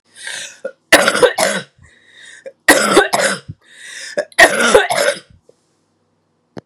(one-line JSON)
{"three_cough_length": "6.7 s", "three_cough_amplitude": 32768, "three_cough_signal_mean_std_ratio": 0.45, "survey_phase": "beta (2021-08-13 to 2022-03-07)", "age": "45-64", "gender": "Female", "wearing_mask": "No", "symptom_cough_any": true, "symptom_runny_or_blocked_nose": true, "symptom_diarrhoea": true, "symptom_fatigue": true, "symptom_headache": true, "symptom_change_to_sense_of_smell_or_taste": true, "symptom_onset": "4 days", "smoker_status": "Ex-smoker", "respiratory_condition_asthma": false, "respiratory_condition_other": false, "recruitment_source": "Test and Trace", "submission_delay": "2 days", "covid_test_result": "Positive", "covid_test_method": "RT-qPCR", "covid_ct_value": 16.6, "covid_ct_gene": "ORF1ab gene", "covid_ct_mean": 17.7, "covid_viral_load": "1500000 copies/ml", "covid_viral_load_category": "High viral load (>1M copies/ml)"}